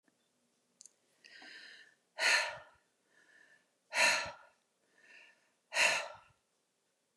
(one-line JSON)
{"exhalation_length": "7.2 s", "exhalation_amplitude": 5295, "exhalation_signal_mean_std_ratio": 0.32, "survey_phase": "beta (2021-08-13 to 2022-03-07)", "age": "45-64", "gender": "Female", "wearing_mask": "No", "symptom_none": true, "smoker_status": "Never smoked", "respiratory_condition_asthma": false, "respiratory_condition_other": false, "recruitment_source": "REACT", "submission_delay": "1 day", "covid_test_result": "Negative", "covid_test_method": "RT-qPCR", "influenza_a_test_result": "Negative", "influenza_b_test_result": "Negative"}